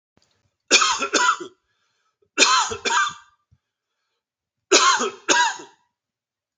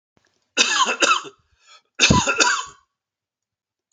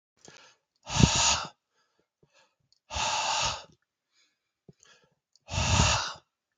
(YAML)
three_cough_length: 6.6 s
three_cough_amplitude: 32768
three_cough_signal_mean_std_ratio: 0.43
cough_length: 3.9 s
cough_amplitude: 30336
cough_signal_mean_std_ratio: 0.44
exhalation_length: 6.6 s
exhalation_amplitude: 20441
exhalation_signal_mean_std_ratio: 0.4
survey_phase: alpha (2021-03-01 to 2021-08-12)
age: 45-64
gender: Male
wearing_mask: 'No'
symptom_none: true
smoker_status: Never smoked
respiratory_condition_asthma: false
respiratory_condition_other: false
recruitment_source: REACT
submission_delay: 1 day
covid_test_result: Negative
covid_test_method: RT-qPCR